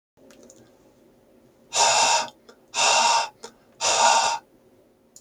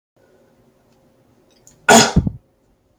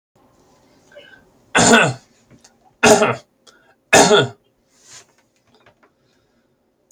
{"exhalation_length": "5.2 s", "exhalation_amplitude": 17055, "exhalation_signal_mean_std_ratio": 0.5, "cough_length": "3.0 s", "cough_amplitude": 32767, "cough_signal_mean_std_ratio": 0.27, "three_cough_length": "6.9 s", "three_cough_amplitude": 32768, "three_cough_signal_mean_std_ratio": 0.31, "survey_phase": "beta (2021-08-13 to 2022-03-07)", "age": "18-44", "gender": "Male", "wearing_mask": "No", "symptom_none": true, "smoker_status": "Never smoked", "respiratory_condition_asthma": false, "respiratory_condition_other": false, "recruitment_source": "REACT", "submission_delay": "7 days", "covid_test_result": "Negative", "covid_test_method": "RT-qPCR"}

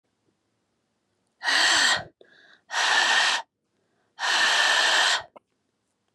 {"exhalation_length": "6.1 s", "exhalation_amplitude": 12291, "exhalation_signal_mean_std_ratio": 0.54, "survey_phase": "beta (2021-08-13 to 2022-03-07)", "age": "18-44", "gender": "Female", "wearing_mask": "No", "symptom_none": true, "smoker_status": "Never smoked", "respiratory_condition_asthma": false, "respiratory_condition_other": false, "recruitment_source": "REACT", "submission_delay": "5 days", "covid_test_result": "Negative", "covid_test_method": "RT-qPCR"}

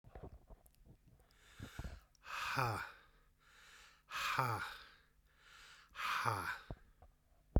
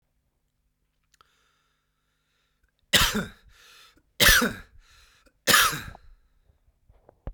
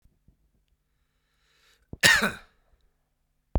{"exhalation_length": "7.6 s", "exhalation_amplitude": 4933, "exhalation_signal_mean_std_ratio": 0.45, "three_cough_length": "7.3 s", "three_cough_amplitude": 23471, "three_cough_signal_mean_std_ratio": 0.28, "cough_length": "3.6 s", "cough_amplitude": 32767, "cough_signal_mean_std_ratio": 0.23, "survey_phase": "beta (2021-08-13 to 2022-03-07)", "age": "45-64", "gender": "Male", "wearing_mask": "No", "symptom_cough_any": true, "symptom_runny_or_blocked_nose": true, "symptom_shortness_of_breath": true, "symptom_abdominal_pain": true, "symptom_fatigue": true, "symptom_headache": true, "symptom_change_to_sense_of_smell_or_taste": true, "smoker_status": "Current smoker (1 to 10 cigarettes per day)", "respiratory_condition_asthma": false, "respiratory_condition_other": false, "recruitment_source": "Test and Trace", "submission_delay": "0 days", "covid_test_result": "Positive", "covid_test_method": "LFT"}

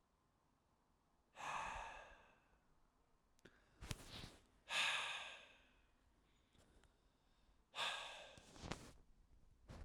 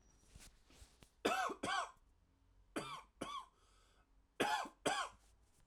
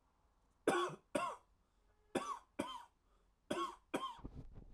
{"exhalation_length": "9.8 s", "exhalation_amplitude": 2601, "exhalation_signal_mean_std_ratio": 0.43, "three_cough_length": "5.7 s", "three_cough_amplitude": 2464, "three_cough_signal_mean_std_ratio": 0.44, "cough_length": "4.7 s", "cough_amplitude": 2936, "cough_signal_mean_std_ratio": 0.44, "survey_phase": "alpha (2021-03-01 to 2021-08-12)", "age": "18-44", "gender": "Male", "wearing_mask": "No", "symptom_none": true, "smoker_status": "Never smoked", "respiratory_condition_asthma": false, "respiratory_condition_other": false, "recruitment_source": "REACT", "submission_delay": "3 days", "covid_test_result": "Negative", "covid_test_method": "RT-qPCR"}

